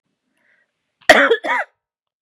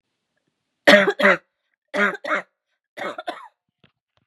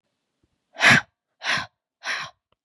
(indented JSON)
{
  "cough_length": "2.2 s",
  "cough_amplitude": 32768,
  "cough_signal_mean_std_ratio": 0.32,
  "three_cough_length": "4.3 s",
  "three_cough_amplitude": 32767,
  "three_cough_signal_mean_std_ratio": 0.32,
  "exhalation_length": "2.6 s",
  "exhalation_amplitude": 24489,
  "exhalation_signal_mean_std_ratio": 0.32,
  "survey_phase": "beta (2021-08-13 to 2022-03-07)",
  "age": "18-44",
  "gender": "Female",
  "wearing_mask": "No",
  "symptom_runny_or_blocked_nose": true,
  "smoker_status": "Current smoker (11 or more cigarettes per day)",
  "respiratory_condition_asthma": false,
  "respiratory_condition_other": false,
  "recruitment_source": "Test and Trace",
  "submission_delay": "2 days",
  "covid_test_result": "Positive",
  "covid_test_method": "RT-qPCR",
  "covid_ct_value": 20.3,
  "covid_ct_gene": "N gene",
  "covid_ct_mean": 21.1,
  "covid_viral_load": "120000 copies/ml",
  "covid_viral_load_category": "Low viral load (10K-1M copies/ml)"
}